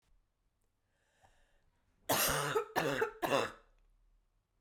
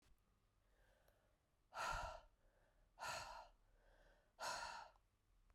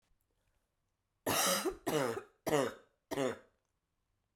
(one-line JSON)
{"cough_length": "4.6 s", "cough_amplitude": 5253, "cough_signal_mean_std_ratio": 0.41, "exhalation_length": "5.5 s", "exhalation_amplitude": 571, "exhalation_signal_mean_std_ratio": 0.46, "three_cough_length": "4.4 s", "three_cough_amplitude": 4925, "three_cough_signal_mean_std_ratio": 0.43, "survey_phase": "beta (2021-08-13 to 2022-03-07)", "age": "45-64", "gender": "Female", "wearing_mask": "No", "symptom_cough_any": true, "symptom_runny_or_blocked_nose": true, "symptom_fever_high_temperature": true, "symptom_headache": true, "symptom_change_to_sense_of_smell_or_taste": true, "symptom_other": true, "symptom_onset": "4 days", "smoker_status": "Never smoked", "respiratory_condition_asthma": false, "respiratory_condition_other": false, "recruitment_source": "Test and Trace", "submission_delay": "3 days", "covid_test_result": "Positive", "covid_test_method": "RT-qPCR", "covid_ct_value": 20.6, "covid_ct_gene": "E gene"}